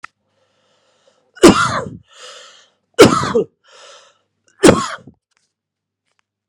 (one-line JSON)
{"three_cough_length": "6.5 s", "three_cough_amplitude": 32768, "three_cough_signal_mean_std_ratio": 0.29, "survey_phase": "beta (2021-08-13 to 2022-03-07)", "age": "45-64", "gender": "Male", "wearing_mask": "No", "symptom_cough_any": true, "symptom_runny_or_blocked_nose": true, "symptom_fatigue": true, "symptom_headache": true, "symptom_change_to_sense_of_smell_or_taste": true, "symptom_onset": "2 days", "smoker_status": "Never smoked", "respiratory_condition_asthma": false, "respiratory_condition_other": false, "recruitment_source": "Test and Trace", "submission_delay": "1 day", "covid_test_result": "Positive", "covid_test_method": "RT-qPCR", "covid_ct_value": 25.3, "covid_ct_gene": "N gene"}